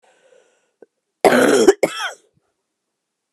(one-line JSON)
{"cough_length": "3.3 s", "cough_amplitude": 32767, "cough_signal_mean_std_ratio": 0.34, "survey_phase": "beta (2021-08-13 to 2022-03-07)", "age": "45-64", "gender": "Female", "wearing_mask": "No", "symptom_cough_any": true, "symptom_runny_or_blocked_nose": true, "symptom_sore_throat": true, "symptom_diarrhoea": true, "symptom_fatigue": true, "symptom_headache": true, "symptom_change_to_sense_of_smell_or_taste": true, "symptom_loss_of_taste": true, "smoker_status": "Ex-smoker", "respiratory_condition_asthma": false, "respiratory_condition_other": false, "recruitment_source": "Test and Trace", "submission_delay": "2 days", "covid_test_result": "Positive", "covid_test_method": "RT-qPCR", "covid_ct_value": 18.4, "covid_ct_gene": "ORF1ab gene", "covid_ct_mean": 18.8, "covid_viral_load": "660000 copies/ml", "covid_viral_load_category": "Low viral load (10K-1M copies/ml)"}